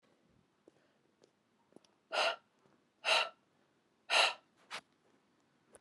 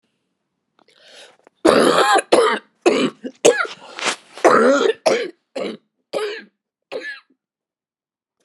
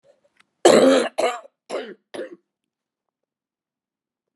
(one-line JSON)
{"exhalation_length": "5.8 s", "exhalation_amplitude": 5376, "exhalation_signal_mean_std_ratio": 0.28, "cough_length": "8.4 s", "cough_amplitude": 32768, "cough_signal_mean_std_ratio": 0.44, "three_cough_length": "4.4 s", "three_cough_amplitude": 30346, "three_cough_signal_mean_std_ratio": 0.31, "survey_phase": "beta (2021-08-13 to 2022-03-07)", "age": "45-64", "gender": "Female", "wearing_mask": "Yes", "symptom_cough_any": true, "symptom_new_continuous_cough": true, "symptom_shortness_of_breath": true, "symptom_sore_throat": true, "symptom_abdominal_pain": true, "symptom_fatigue": true, "symptom_headache": true, "symptom_change_to_sense_of_smell_or_taste": true, "symptom_onset": "11 days", "smoker_status": "Never smoked", "respiratory_condition_asthma": false, "respiratory_condition_other": false, "recruitment_source": "Test and Trace", "submission_delay": "3 days", "covid_test_result": "Positive", "covid_test_method": "RT-qPCR"}